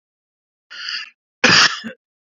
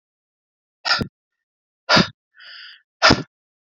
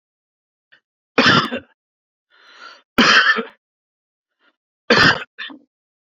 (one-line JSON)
{"cough_length": "2.4 s", "cough_amplitude": 32767, "cough_signal_mean_std_ratio": 0.34, "exhalation_length": "3.8 s", "exhalation_amplitude": 28113, "exhalation_signal_mean_std_ratio": 0.28, "three_cough_length": "6.1 s", "three_cough_amplitude": 30246, "three_cough_signal_mean_std_ratio": 0.34, "survey_phase": "beta (2021-08-13 to 2022-03-07)", "age": "18-44", "gender": "Male", "wearing_mask": "No", "symptom_none": true, "smoker_status": "Ex-smoker", "respiratory_condition_asthma": false, "respiratory_condition_other": false, "recruitment_source": "REACT", "submission_delay": "1 day", "covid_test_result": "Negative", "covid_test_method": "RT-qPCR"}